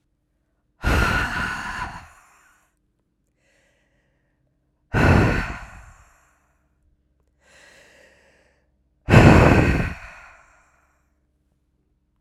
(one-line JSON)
{"exhalation_length": "12.2 s", "exhalation_amplitude": 32768, "exhalation_signal_mean_std_ratio": 0.32, "survey_phase": "alpha (2021-03-01 to 2021-08-12)", "age": "45-64", "gender": "Female", "wearing_mask": "No", "symptom_cough_any": true, "symptom_shortness_of_breath": true, "symptom_fatigue": true, "symptom_headache": true, "symptom_change_to_sense_of_smell_or_taste": true, "symptom_loss_of_taste": true, "smoker_status": "Prefer not to say", "respiratory_condition_asthma": false, "respiratory_condition_other": false, "recruitment_source": "Test and Trace", "submission_delay": "2 days", "covid_test_result": "Positive", "covid_test_method": "RT-qPCR"}